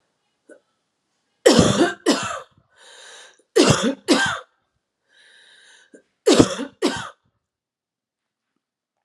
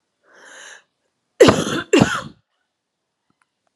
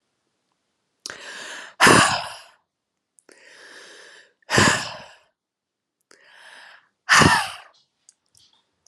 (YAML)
three_cough_length: 9.0 s
three_cough_amplitude: 32767
three_cough_signal_mean_std_ratio: 0.34
cough_length: 3.8 s
cough_amplitude: 32768
cough_signal_mean_std_ratio: 0.29
exhalation_length: 8.9 s
exhalation_amplitude: 32306
exhalation_signal_mean_std_ratio: 0.3
survey_phase: alpha (2021-03-01 to 2021-08-12)
age: 18-44
gender: Female
wearing_mask: 'No'
symptom_cough_any: true
symptom_new_continuous_cough: true
symptom_headache: true
symptom_change_to_sense_of_smell_or_taste: true
symptom_loss_of_taste: true
symptom_onset: 3 days
smoker_status: Never smoked
respiratory_condition_asthma: false
respiratory_condition_other: false
recruitment_source: Test and Trace
submission_delay: 2 days
covid_test_result: Positive
covid_test_method: RT-qPCR